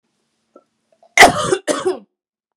{"cough_length": "2.6 s", "cough_amplitude": 32768, "cough_signal_mean_std_ratio": 0.32, "survey_phase": "beta (2021-08-13 to 2022-03-07)", "age": "18-44", "gender": "Female", "wearing_mask": "No", "symptom_none": true, "smoker_status": "Never smoked", "respiratory_condition_asthma": true, "respiratory_condition_other": false, "recruitment_source": "Test and Trace", "submission_delay": "3 days", "covid_test_result": "Negative", "covid_test_method": "RT-qPCR"}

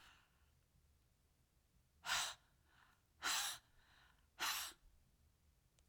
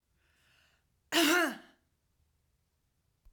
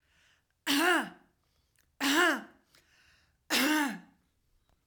{"exhalation_length": "5.9 s", "exhalation_amplitude": 1229, "exhalation_signal_mean_std_ratio": 0.36, "cough_length": "3.3 s", "cough_amplitude": 7012, "cough_signal_mean_std_ratio": 0.29, "three_cough_length": "4.9 s", "three_cough_amplitude": 6559, "three_cough_signal_mean_std_ratio": 0.43, "survey_phase": "beta (2021-08-13 to 2022-03-07)", "age": "45-64", "gender": "Female", "wearing_mask": "No", "symptom_none": true, "smoker_status": "Ex-smoker", "respiratory_condition_asthma": false, "respiratory_condition_other": false, "recruitment_source": "REACT", "submission_delay": "1 day", "covid_test_result": "Negative", "covid_test_method": "RT-qPCR", "influenza_a_test_result": "Negative", "influenza_b_test_result": "Negative"}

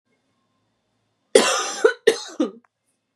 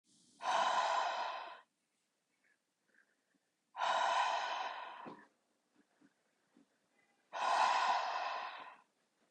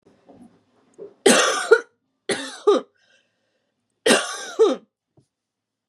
{"cough_length": "3.2 s", "cough_amplitude": 32768, "cough_signal_mean_std_ratio": 0.32, "exhalation_length": "9.3 s", "exhalation_amplitude": 2968, "exhalation_signal_mean_std_ratio": 0.52, "three_cough_length": "5.9 s", "three_cough_amplitude": 31025, "three_cough_signal_mean_std_ratio": 0.35, "survey_phase": "beta (2021-08-13 to 2022-03-07)", "age": "18-44", "gender": "Female", "wearing_mask": "No", "symptom_none": true, "smoker_status": "Ex-smoker", "respiratory_condition_asthma": false, "respiratory_condition_other": false, "recruitment_source": "REACT", "submission_delay": "1 day", "covid_test_result": "Negative", "covid_test_method": "RT-qPCR", "influenza_a_test_result": "Unknown/Void", "influenza_b_test_result": "Unknown/Void"}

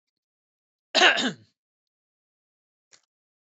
{"cough_length": "3.6 s", "cough_amplitude": 17473, "cough_signal_mean_std_ratio": 0.23, "survey_phase": "beta (2021-08-13 to 2022-03-07)", "age": "45-64", "gender": "Male", "wearing_mask": "No", "symptom_none": true, "smoker_status": "Never smoked", "respiratory_condition_asthma": false, "respiratory_condition_other": false, "recruitment_source": "REACT", "submission_delay": "3 days", "covid_test_result": "Negative", "covid_test_method": "RT-qPCR", "covid_ct_value": 43.0, "covid_ct_gene": "N gene"}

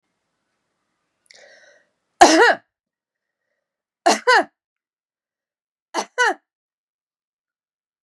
{"three_cough_length": "8.0 s", "three_cough_amplitude": 32768, "three_cough_signal_mean_std_ratio": 0.24, "survey_phase": "beta (2021-08-13 to 2022-03-07)", "age": "45-64", "gender": "Female", "wearing_mask": "No", "symptom_runny_or_blocked_nose": true, "symptom_diarrhoea": true, "symptom_fatigue": true, "smoker_status": "Never smoked", "respiratory_condition_asthma": false, "respiratory_condition_other": false, "recruitment_source": "Test and Trace", "submission_delay": "2 days", "covid_test_result": "Positive", "covid_test_method": "LFT"}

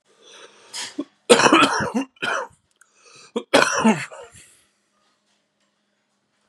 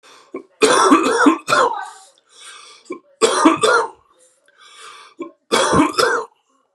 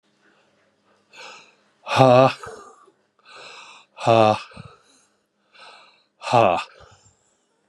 {"cough_length": "6.5 s", "cough_amplitude": 32768, "cough_signal_mean_std_ratio": 0.36, "three_cough_length": "6.7 s", "three_cough_amplitude": 32767, "three_cough_signal_mean_std_ratio": 0.52, "exhalation_length": "7.7 s", "exhalation_amplitude": 32767, "exhalation_signal_mean_std_ratio": 0.3, "survey_phase": "beta (2021-08-13 to 2022-03-07)", "age": "45-64", "gender": "Male", "wearing_mask": "No", "symptom_cough_any": true, "symptom_new_continuous_cough": true, "symptom_runny_or_blocked_nose": true, "symptom_shortness_of_breath": true, "symptom_sore_throat": true, "symptom_fatigue": true, "symptom_fever_high_temperature": true, "symptom_onset": "3 days", "smoker_status": "Ex-smoker", "respiratory_condition_asthma": true, "respiratory_condition_other": false, "recruitment_source": "Test and Trace", "submission_delay": "2 days", "covid_test_result": "Positive", "covid_test_method": "ePCR"}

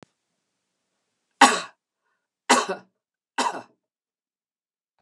{"three_cough_length": "5.0 s", "three_cough_amplitude": 32766, "three_cough_signal_mean_std_ratio": 0.22, "survey_phase": "beta (2021-08-13 to 2022-03-07)", "age": "65+", "gender": "Female", "wearing_mask": "No", "symptom_none": true, "smoker_status": "Never smoked", "respiratory_condition_asthma": false, "respiratory_condition_other": false, "recruitment_source": "REACT", "submission_delay": "2 days", "covid_test_result": "Negative", "covid_test_method": "RT-qPCR", "influenza_a_test_result": "Negative", "influenza_b_test_result": "Negative"}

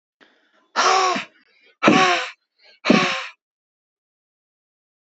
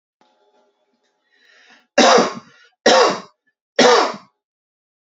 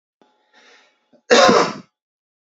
{"exhalation_length": "5.1 s", "exhalation_amplitude": 27679, "exhalation_signal_mean_std_ratio": 0.39, "three_cough_length": "5.1 s", "three_cough_amplitude": 32767, "three_cough_signal_mean_std_ratio": 0.36, "cough_length": "2.6 s", "cough_amplitude": 30013, "cough_signal_mean_std_ratio": 0.33, "survey_phase": "beta (2021-08-13 to 2022-03-07)", "age": "18-44", "gender": "Male", "wearing_mask": "No", "symptom_none": true, "smoker_status": "Never smoked", "respiratory_condition_asthma": false, "respiratory_condition_other": false, "recruitment_source": "REACT", "submission_delay": "1 day", "covid_test_result": "Negative", "covid_test_method": "RT-qPCR", "influenza_a_test_result": "Negative", "influenza_b_test_result": "Negative"}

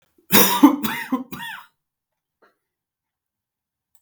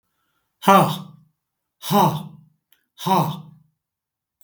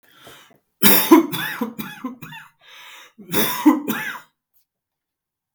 {"three_cough_length": "4.0 s", "three_cough_amplitude": 32768, "three_cough_signal_mean_std_ratio": 0.3, "exhalation_length": "4.4 s", "exhalation_amplitude": 32768, "exhalation_signal_mean_std_ratio": 0.36, "cough_length": "5.5 s", "cough_amplitude": 32768, "cough_signal_mean_std_ratio": 0.37, "survey_phase": "beta (2021-08-13 to 2022-03-07)", "age": "65+", "gender": "Male", "wearing_mask": "No", "symptom_none": true, "symptom_onset": "12 days", "smoker_status": "Never smoked", "respiratory_condition_asthma": false, "respiratory_condition_other": false, "recruitment_source": "REACT", "submission_delay": "1 day", "covid_test_result": "Positive", "covid_test_method": "RT-qPCR", "covid_ct_value": 33.0, "covid_ct_gene": "N gene", "influenza_a_test_result": "Negative", "influenza_b_test_result": "Negative"}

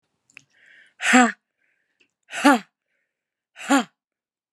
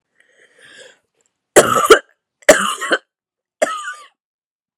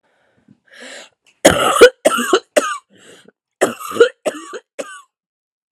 {"exhalation_length": "4.5 s", "exhalation_amplitude": 28543, "exhalation_signal_mean_std_ratio": 0.28, "three_cough_length": "4.8 s", "three_cough_amplitude": 32768, "three_cough_signal_mean_std_ratio": 0.31, "cough_length": "5.7 s", "cough_amplitude": 32768, "cough_signal_mean_std_ratio": 0.35, "survey_phase": "alpha (2021-03-01 to 2021-08-12)", "age": "45-64", "gender": "Female", "wearing_mask": "No", "symptom_cough_any": true, "symptom_new_continuous_cough": true, "symptom_diarrhoea": true, "symptom_fatigue": true, "symptom_headache": true, "symptom_onset": "3 days", "smoker_status": "Never smoked", "respiratory_condition_asthma": false, "respiratory_condition_other": false, "recruitment_source": "Test and Trace", "submission_delay": "2 days", "covid_test_result": "Positive", "covid_test_method": "RT-qPCR", "covid_ct_value": 24.5, "covid_ct_gene": "ORF1ab gene", "covid_ct_mean": 25.1, "covid_viral_load": "5900 copies/ml", "covid_viral_load_category": "Minimal viral load (< 10K copies/ml)"}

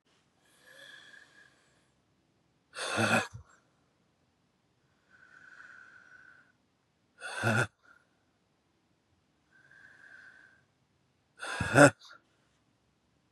{"exhalation_length": "13.3 s", "exhalation_amplitude": 19035, "exhalation_signal_mean_std_ratio": 0.21, "survey_phase": "beta (2021-08-13 to 2022-03-07)", "age": "18-44", "gender": "Male", "wearing_mask": "No", "symptom_cough_any": true, "symptom_runny_or_blocked_nose": true, "symptom_sore_throat": true, "symptom_fever_high_temperature": true, "symptom_onset": "4 days", "smoker_status": "Current smoker (1 to 10 cigarettes per day)", "respiratory_condition_asthma": false, "respiratory_condition_other": false, "recruitment_source": "Test and Trace", "submission_delay": "2 days", "covid_test_result": "Positive", "covid_test_method": "RT-qPCR", "covid_ct_value": 23.4, "covid_ct_gene": "ORF1ab gene", "covid_ct_mean": 24.1, "covid_viral_load": "12000 copies/ml", "covid_viral_load_category": "Low viral load (10K-1M copies/ml)"}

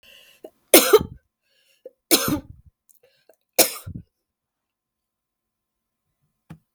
{"three_cough_length": "6.7 s", "three_cough_amplitude": 32768, "three_cough_signal_mean_std_ratio": 0.22, "survey_phase": "beta (2021-08-13 to 2022-03-07)", "age": "45-64", "gender": "Female", "wearing_mask": "No", "symptom_shortness_of_breath": true, "smoker_status": "Never smoked", "respiratory_condition_asthma": false, "respiratory_condition_other": false, "recruitment_source": "REACT", "submission_delay": "2 days", "covid_test_result": "Negative", "covid_test_method": "RT-qPCR", "influenza_a_test_result": "Negative", "influenza_b_test_result": "Negative"}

